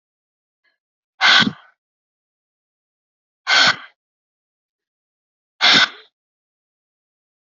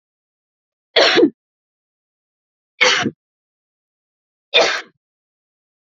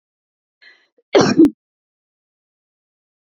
{"exhalation_length": "7.4 s", "exhalation_amplitude": 32767, "exhalation_signal_mean_std_ratio": 0.26, "three_cough_length": "6.0 s", "three_cough_amplitude": 29913, "three_cough_signal_mean_std_ratio": 0.3, "cough_length": "3.3 s", "cough_amplitude": 32076, "cough_signal_mean_std_ratio": 0.25, "survey_phase": "beta (2021-08-13 to 2022-03-07)", "age": "45-64", "gender": "Female", "wearing_mask": "No", "symptom_none": true, "smoker_status": "Ex-smoker", "respiratory_condition_asthma": false, "respiratory_condition_other": false, "recruitment_source": "REACT", "submission_delay": "2 days", "covid_test_result": "Negative", "covid_test_method": "RT-qPCR"}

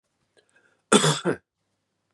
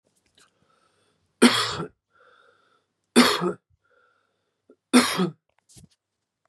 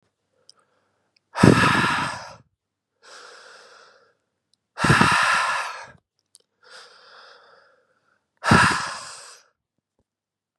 {"cough_length": "2.1 s", "cough_amplitude": 28195, "cough_signal_mean_std_ratio": 0.3, "three_cough_length": "6.5 s", "three_cough_amplitude": 26293, "three_cough_signal_mean_std_ratio": 0.29, "exhalation_length": "10.6 s", "exhalation_amplitude": 32767, "exhalation_signal_mean_std_ratio": 0.35, "survey_phase": "beta (2021-08-13 to 2022-03-07)", "age": "18-44", "gender": "Male", "wearing_mask": "No", "symptom_cough_any": true, "symptom_runny_or_blocked_nose": true, "symptom_sore_throat": true, "symptom_fatigue": true, "symptom_change_to_sense_of_smell_or_taste": true, "symptom_onset": "3 days", "smoker_status": "Never smoked", "respiratory_condition_asthma": false, "respiratory_condition_other": false, "recruitment_source": "Test and Trace", "submission_delay": "2 days", "covid_test_result": "Positive", "covid_test_method": "RT-qPCR", "covid_ct_value": 20.8, "covid_ct_gene": "N gene"}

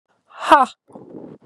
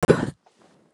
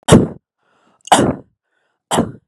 {"exhalation_length": "1.5 s", "exhalation_amplitude": 32768, "exhalation_signal_mean_std_ratio": 0.3, "cough_length": "0.9 s", "cough_amplitude": 29704, "cough_signal_mean_std_ratio": 0.31, "three_cough_length": "2.5 s", "three_cough_amplitude": 32768, "three_cough_signal_mean_std_ratio": 0.37, "survey_phase": "beta (2021-08-13 to 2022-03-07)", "age": "18-44", "gender": "Female", "wearing_mask": "No", "symptom_cough_any": true, "symptom_new_continuous_cough": true, "symptom_runny_or_blocked_nose": true, "symptom_shortness_of_breath": true, "symptom_sore_throat": true, "symptom_fatigue": true, "symptom_fever_high_temperature": true, "symptom_change_to_sense_of_smell_or_taste": true, "symptom_loss_of_taste": true, "smoker_status": "Never smoked", "respiratory_condition_asthma": false, "respiratory_condition_other": false, "recruitment_source": "Test and Trace", "submission_delay": "2 days", "covid_test_result": "Positive", "covid_test_method": "RT-qPCR", "covid_ct_value": 18.4, "covid_ct_gene": "ORF1ab gene", "covid_ct_mean": 20.4, "covid_viral_load": "200000 copies/ml", "covid_viral_load_category": "Low viral load (10K-1M copies/ml)"}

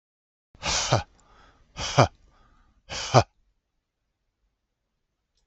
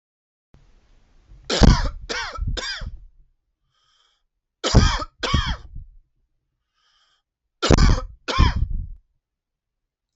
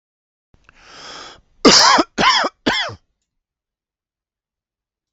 {"exhalation_length": "5.5 s", "exhalation_amplitude": 30378, "exhalation_signal_mean_std_ratio": 0.26, "three_cough_length": "10.2 s", "three_cough_amplitude": 32766, "three_cough_signal_mean_std_ratio": 0.36, "cough_length": "5.1 s", "cough_amplitude": 32768, "cough_signal_mean_std_ratio": 0.34, "survey_phase": "beta (2021-08-13 to 2022-03-07)", "age": "45-64", "gender": "Male", "wearing_mask": "No", "symptom_none": true, "smoker_status": "Ex-smoker", "respiratory_condition_asthma": false, "respiratory_condition_other": false, "recruitment_source": "REACT", "submission_delay": "1 day", "covid_test_result": "Negative", "covid_test_method": "RT-qPCR", "influenza_a_test_result": "Unknown/Void", "influenza_b_test_result": "Unknown/Void"}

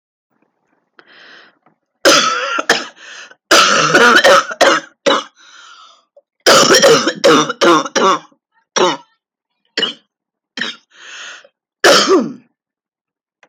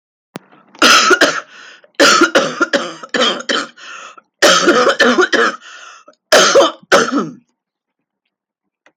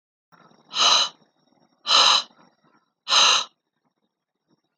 {"three_cough_length": "13.5 s", "three_cough_amplitude": 32768, "three_cough_signal_mean_std_ratio": 0.48, "cough_length": "9.0 s", "cough_amplitude": 32768, "cough_signal_mean_std_ratio": 0.53, "exhalation_length": "4.8 s", "exhalation_amplitude": 23947, "exhalation_signal_mean_std_ratio": 0.38, "survey_phase": "beta (2021-08-13 to 2022-03-07)", "age": "45-64", "gender": "Female", "wearing_mask": "No", "symptom_new_continuous_cough": true, "symptom_sore_throat": true, "symptom_fatigue": true, "symptom_change_to_sense_of_smell_or_taste": true, "symptom_loss_of_taste": true, "symptom_other": true, "symptom_onset": "11 days", "smoker_status": "Ex-smoker", "respiratory_condition_asthma": false, "respiratory_condition_other": false, "recruitment_source": "REACT", "submission_delay": "2 days", "covid_test_result": "Positive", "covid_test_method": "RT-qPCR", "covid_ct_value": 37.0, "covid_ct_gene": "E gene", "influenza_a_test_result": "Unknown/Void", "influenza_b_test_result": "Unknown/Void"}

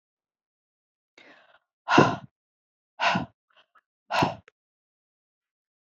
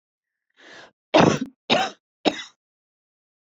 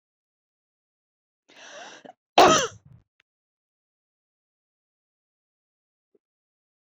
{"exhalation_length": "5.9 s", "exhalation_amplitude": 19251, "exhalation_signal_mean_std_ratio": 0.25, "three_cough_length": "3.6 s", "three_cough_amplitude": 25769, "three_cough_signal_mean_std_ratio": 0.3, "cough_length": "6.9 s", "cough_amplitude": 21129, "cough_signal_mean_std_ratio": 0.16, "survey_phase": "beta (2021-08-13 to 2022-03-07)", "age": "65+", "gender": "Female", "wearing_mask": "No", "symptom_none": true, "smoker_status": "Ex-smoker", "respiratory_condition_asthma": false, "respiratory_condition_other": false, "recruitment_source": "REACT", "submission_delay": "3 days", "covid_test_result": "Negative", "covid_test_method": "RT-qPCR"}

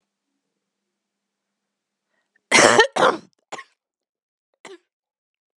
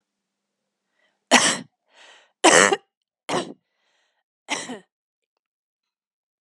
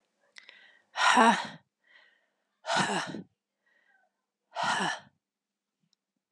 {"cough_length": "5.6 s", "cough_amplitude": 32767, "cough_signal_mean_std_ratio": 0.23, "three_cough_length": "6.4 s", "three_cough_amplitude": 32732, "three_cough_signal_mean_std_ratio": 0.25, "exhalation_length": "6.3 s", "exhalation_amplitude": 13200, "exhalation_signal_mean_std_ratio": 0.34, "survey_phase": "beta (2021-08-13 to 2022-03-07)", "age": "18-44", "gender": "Female", "wearing_mask": "No", "symptom_new_continuous_cough": true, "symptom_abdominal_pain": true, "symptom_diarrhoea": true, "symptom_headache": true, "symptom_loss_of_taste": true, "symptom_onset": "4 days", "smoker_status": "Ex-smoker", "respiratory_condition_asthma": false, "respiratory_condition_other": false, "recruitment_source": "Test and Trace", "submission_delay": "2 days", "covid_test_result": "Positive", "covid_test_method": "RT-qPCR", "covid_ct_value": 15.6, "covid_ct_gene": "ORF1ab gene"}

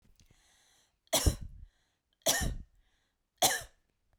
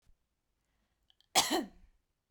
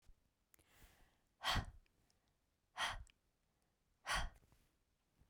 {"three_cough_length": "4.2 s", "three_cough_amplitude": 10241, "three_cough_signal_mean_std_ratio": 0.33, "cough_length": "2.3 s", "cough_amplitude": 8207, "cough_signal_mean_std_ratio": 0.27, "exhalation_length": "5.3 s", "exhalation_amplitude": 1550, "exhalation_signal_mean_std_ratio": 0.31, "survey_phase": "beta (2021-08-13 to 2022-03-07)", "age": "18-44", "gender": "Female", "wearing_mask": "No", "symptom_none": true, "symptom_onset": "3 days", "smoker_status": "Never smoked", "respiratory_condition_asthma": false, "respiratory_condition_other": false, "recruitment_source": "Test and Trace", "submission_delay": "2 days", "covid_test_result": "Positive", "covid_test_method": "RT-qPCR", "covid_ct_value": 30.3, "covid_ct_gene": "N gene"}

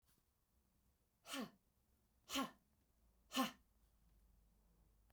{"exhalation_length": "5.1 s", "exhalation_amplitude": 1566, "exhalation_signal_mean_std_ratio": 0.28, "survey_phase": "beta (2021-08-13 to 2022-03-07)", "age": "45-64", "gender": "Female", "wearing_mask": "No", "symptom_runny_or_blocked_nose": true, "smoker_status": "Never smoked", "respiratory_condition_asthma": false, "respiratory_condition_other": true, "recruitment_source": "REACT", "submission_delay": "1 day", "covid_test_result": "Negative", "covid_test_method": "RT-qPCR"}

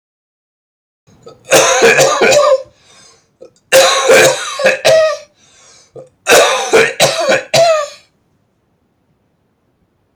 {"three_cough_length": "10.2 s", "three_cough_amplitude": 32768, "three_cough_signal_mean_std_ratio": 0.55, "survey_phase": "beta (2021-08-13 to 2022-03-07)", "age": "45-64", "gender": "Male", "wearing_mask": "No", "symptom_cough_any": true, "symptom_runny_or_blocked_nose": true, "symptom_sore_throat": true, "symptom_onset": "2 days", "smoker_status": "Ex-smoker", "respiratory_condition_asthma": false, "respiratory_condition_other": false, "recruitment_source": "Test and Trace", "submission_delay": "1 day", "covid_test_result": "Positive", "covid_test_method": "RT-qPCR", "covid_ct_value": 33.7, "covid_ct_gene": "N gene"}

